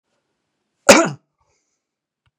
{"cough_length": "2.4 s", "cough_amplitude": 32768, "cough_signal_mean_std_ratio": 0.21, "survey_phase": "beta (2021-08-13 to 2022-03-07)", "age": "65+", "gender": "Male", "wearing_mask": "No", "symptom_none": true, "smoker_status": "Ex-smoker", "respiratory_condition_asthma": false, "respiratory_condition_other": false, "recruitment_source": "REACT", "submission_delay": "2 days", "covid_test_result": "Negative", "covid_test_method": "RT-qPCR", "influenza_a_test_result": "Negative", "influenza_b_test_result": "Negative"}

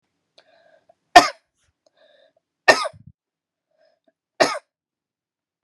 {"three_cough_length": "5.6 s", "three_cough_amplitude": 32768, "three_cough_signal_mean_std_ratio": 0.17, "survey_phase": "beta (2021-08-13 to 2022-03-07)", "age": "18-44", "gender": "Female", "wearing_mask": "No", "symptom_cough_any": true, "symptom_runny_or_blocked_nose": true, "symptom_sore_throat": true, "symptom_fatigue": true, "smoker_status": "Never smoked", "respiratory_condition_asthma": false, "respiratory_condition_other": false, "recruitment_source": "Test and Trace", "submission_delay": "1 day", "covid_test_result": "Positive", "covid_test_method": "RT-qPCR", "covid_ct_value": 19.6, "covid_ct_gene": "ORF1ab gene", "covid_ct_mean": 20.1, "covid_viral_load": "250000 copies/ml", "covid_viral_load_category": "Low viral load (10K-1M copies/ml)"}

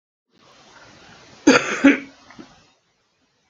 {"cough_length": "3.5 s", "cough_amplitude": 32768, "cough_signal_mean_std_ratio": 0.27, "survey_phase": "alpha (2021-03-01 to 2021-08-12)", "age": "65+", "gender": "Male", "wearing_mask": "No", "symptom_none": true, "smoker_status": "Never smoked", "respiratory_condition_asthma": false, "respiratory_condition_other": false, "recruitment_source": "REACT", "submission_delay": "2 days", "covid_test_result": "Negative", "covid_test_method": "RT-qPCR"}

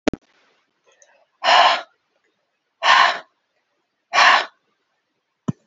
{"exhalation_length": "5.7 s", "exhalation_amplitude": 30287, "exhalation_signal_mean_std_ratio": 0.34, "survey_phase": "beta (2021-08-13 to 2022-03-07)", "age": "45-64", "gender": "Female", "wearing_mask": "No", "symptom_cough_any": true, "symptom_runny_or_blocked_nose": true, "symptom_abdominal_pain": true, "symptom_fatigue": true, "symptom_headache": true, "symptom_change_to_sense_of_smell_or_taste": true, "smoker_status": "Never smoked", "respiratory_condition_asthma": false, "respiratory_condition_other": false, "recruitment_source": "Test and Trace", "submission_delay": "2 days", "covid_test_result": "Positive", "covid_test_method": "RT-qPCR", "covid_ct_value": 17.4, "covid_ct_gene": "ORF1ab gene", "covid_ct_mean": 18.4, "covid_viral_load": "910000 copies/ml", "covid_viral_load_category": "Low viral load (10K-1M copies/ml)"}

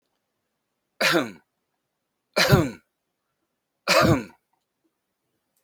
{"three_cough_length": "5.6 s", "three_cough_amplitude": 23667, "three_cough_signal_mean_std_ratio": 0.32, "survey_phase": "beta (2021-08-13 to 2022-03-07)", "age": "65+", "gender": "Male", "wearing_mask": "No", "symptom_none": true, "smoker_status": "Never smoked", "respiratory_condition_asthma": false, "respiratory_condition_other": false, "recruitment_source": "REACT", "submission_delay": "4 days", "covid_test_result": "Negative", "covid_test_method": "RT-qPCR", "influenza_a_test_result": "Negative", "influenza_b_test_result": "Negative"}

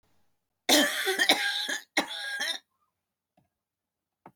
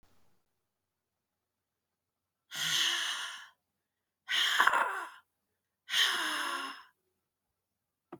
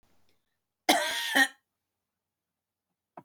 {"three_cough_length": "4.4 s", "three_cough_amplitude": 18691, "three_cough_signal_mean_std_ratio": 0.44, "exhalation_length": "8.2 s", "exhalation_amplitude": 13391, "exhalation_signal_mean_std_ratio": 0.42, "cough_length": "3.2 s", "cough_amplitude": 13213, "cough_signal_mean_std_ratio": 0.3, "survey_phase": "beta (2021-08-13 to 2022-03-07)", "age": "65+", "gender": "Female", "wearing_mask": "No", "symptom_cough_any": true, "symptom_sore_throat": true, "smoker_status": "Never smoked", "respiratory_condition_asthma": false, "respiratory_condition_other": false, "recruitment_source": "REACT", "submission_delay": "2 days", "covid_test_result": "Negative", "covid_test_method": "RT-qPCR"}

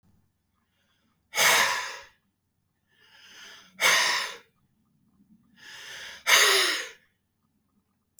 {"exhalation_length": "8.2 s", "exhalation_amplitude": 17321, "exhalation_signal_mean_std_ratio": 0.37, "survey_phase": "beta (2021-08-13 to 2022-03-07)", "age": "45-64", "gender": "Male", "wearing_mask": "No", "symptom_shortness_of_breath": true, "symptom_fatigue": true, "symptom_onset": "12 days", "smoker_status": "Never smoked", "respiratory_condition_asthma": false, "respiratory_condition_other": false, "recruitment_source": "REACT", "submission_delay": "1 day", "covid_test_result": "Negative", "covid_test_method": "RT-qPCR", "influenza_a_test_result": "Negative", "influenza_b_test_result": "Negative"}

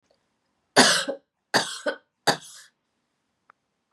{"three_cough_length": "3.9 s", "three_cough_amplitude": 31628, "three_cough_signal_mean_std_ratio": 0.3, "survey_phase": "beta (2021-08-13 to 2022-03-07)", "age": "45-64", "gender": "Female", "wearing_mask": "No", "symptom_cough_any": true, "symptom_new_continuous_cough": true, "symptom_runny_or_blocked_nose": true, "symptom_shortness_of_breath": true, "symptom_fatigue": true, "symptom_headache": true, "symptom_change_to_sense_of_smell_or_taste": true, "symptom_onset": "4 days", "smoker_status": "Never smoked", "respiratory_condition_asthma": false, "respiratory_condition_other": false, "recruitment_source": "Test and Trace", "submission_delay": "1 day", "covid_test_result": "Positive", "covid_test_method": "RT-qPCR", "covid_ct_value": 24.7, "covid_ct_gene": "ORF1ab gene"}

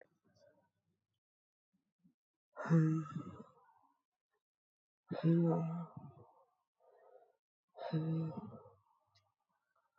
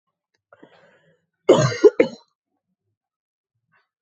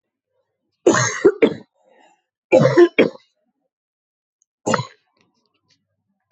{"exhalation_length": "10.0 s", "exhalation_amplitude": 3210, "exhalation_signal_mean_std_ratio": 0.35, "cough_length": "4.0 s", "cough_amplitude": 27386, "cough_signal_mean_std_ratio": 0.23, "three_cough_length": "6.3 s", "three_cough_amplitude": 27585, "three_cough_signal_mean_std_ratio": 0.31, "survey_phase": "alpha (2021-03-01 to 2021-08-12)", "age": "18-44", "gender": "Female", "wearing_mask": "No", "symptom_cough_any": true, "symptom_abdominal_pain": true, "symptom_fatigue": true, "symptom_headache": true, "smoker_status": "Never smoked", "respiratory_condition_asthma": false, "respiratory_condition_other": false, "recruitment_source": "Test and Trace", "submission_delay": "1 day", "covid_test_result": "Positive", "covid_test_method": "RT-qPCR", "covid_ct_value": 15.1, "covid_ct_gene": "ORF1ab gene"}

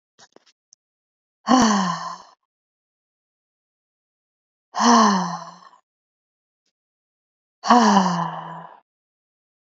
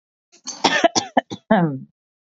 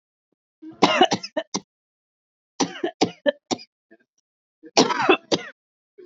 {"exhalation_length": "9.6 s", "exhalation_amplitude": 26732, "exhalation_signal_mean_std_ratio": 0.35, "cough_length": "2.4 s", "cough_amplitude": 27960, "cough_signal_mean_std_ratio": 0.41, "three_cough_length": "6.1 s", "three_cough_amplitude": 27726, "three_cough_signal_mean_std_ratio": 0.33, "survey_phase": "beta (2021-08-13 to 2022-03-07)", "age": "18-44", "gender": "Female", "wearing_mask": "No", "symptom_none": true, "smoker_status": "Never smoked", "respiratory_condition_asthma": false, "respiratory_condition_other": false, "recruitment_source": "REACT", "submission_delay": "2 days", "covid_test_result": "Negative", "covid_test_method": "RT-qPCR"}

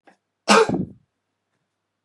{"cough_length": "2.0 s", "cough_amplitude": 28723, "cough_signal_mean_std_ratio": 0.31, "survey_phase": "beta (2021-08-13 to 2022-03-07)", "age": "65+", "gender": "Male", "wearing_mask": "No", "symptom_runny_or_blocked_nose": true, "symptom_onset": "3 days", "smoker_status": "Never smoked", "respiratory_condition_asthma": false, "respiratory_condition_other": false, "recruitment_source": "Test and Trace", "submission_delay": "2 days", "covid_test_result": "Positive", "covid_test_method": "RT-qPCR", "covid_ct_value": 19.9, "covid_ct_gene": "ORF1ab gene", "covid_ct_mean": 20.4, "covid_viral_load": "210000 copies/ml", "covid_viral_load_category": "Low viral load (10K-1M copies/ml)"}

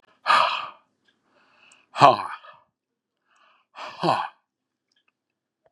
{"exhalation_length": "5.7 s", "exhalation_amplitude": 32768, "exhalation_signal_mean_std_ratio": 0.28, "survey_phase": "beta (2021-08-13 to 2022-03-07)", "age": "65+", "gender": "Male", "wearing_mask": "No", "symptom_none": true, "smoker_status": "Ex-smoker", "respiratory_condition_asthma": false, "respiratory_condition_other": false, "recruitment_source": "REACT", "submission_delay": "2 days", "covid_test_result": "Negative", "covid_test_method": "RT-qPCR", "influenza_a_test_result": "Negative", "influenza_b_test_result": "Negative"}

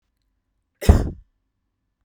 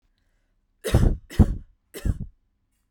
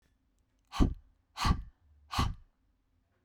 {"cough_length": "2.0 s", "cough_amplitude": 32767, "cough_signal_mean_std_ratio": 0.22, "three_cough_length": "2.9 s", "three_cough_amplitude": 24003, "three_cough_signal_mean_std_ratio": 0.33, "exhalation_length": "3.2 s", "exhalation_amplitude": 7034, "exhalation_signal_mean_std_ratio": 0.33, "survey_phase": "beta (2021-08-13 to 2022-03-07)", "age": "18-44", "gender": "Female", "wearing_mask": "No", "symptom_none": true, "smoker_status": "Never smoked", "respiratory_condition_asthma": false, "respiratory_condition_other": false, "recruitment_source": "REACT", "submission_delay": "2 days", "covid_test_result": "Negative", "covid_test_method": "RT-qPCR"}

